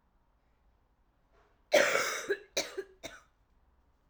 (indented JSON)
{
  "cough_length": "4.1 s",
  "cough_amplitude": 9993,
  "cough_signal_mean_std_ratio": 0.33,
  "survey_phase": "alpha (2021-03-01 to 2021-08-12)",
  "age": "18-44",
  "gender": "Female",
  "wearing_mask": "No",
  "symptom_cough_any": true,
  "symptom_new_continuous_cough": true,
  "symptom_shortness_of_breath": true,
  "symptom_abdominal_pain": true,
  "symptom_diarrhoea": true,
  "symptom_fatigue": true,
  "symptom_fever_high_temperature": true,
  "symptom_headache": true,
  "symptom_change_to_sense_of_smell_or_taste": true,
  "symptom_loss_of_taste": true,
  "symptom_onset": "2 days",
  "smoker_status": "Never smoked",
  "respiratory_condition_asthma": false,
  "respiratory_condition_other": false,
  "recruitment_source": "Test and Trace",
  "submission_delay": "2 days",
  "covid_test_result": "Positive",
  "covid_test_method": "RT-qPCR",
  "covid_ct_value": 22.9,
  "covid_ct_gene": "ORF1ab gene",
  "covid_ct_mean": 23.9,
  "covid_viral_load": "14000 copies/ml",
  "covid_viral_load_category": "Low viral load (10K-1M copies/ml)"
}